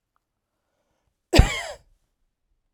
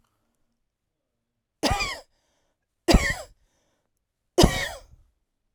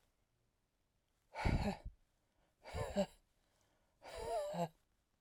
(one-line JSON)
{"cough_length": "2.7 s", "cough_amplitude": 32767, "cough_signal_mean_std_ratio": 0.2, "three_cough_length": "5.5 s", "three_cough_amplitude": 23881, "three_cough_signal_mean_std_ratio": 0.27, "exhalation_length": "5.2 s", "exhalation_amplitude": 2395, "exhalation_signal_mean_std_ratio": 0.4, "survey_phase": "alpha (2021-03-01 to 2021-08-12)", "age": "45-64", "gender": "Female", "wearing_mask": "No", "symptom_none": true, "smoker_status": "Ex-smoker", "respiratory_condition_asthma": true, "respiratory_condition_other": false, "recruitment_source": "REACT", "submission_delay": "1 day", "covid_test_result": "Negative", "covid_test_method": "RT-qPCR"}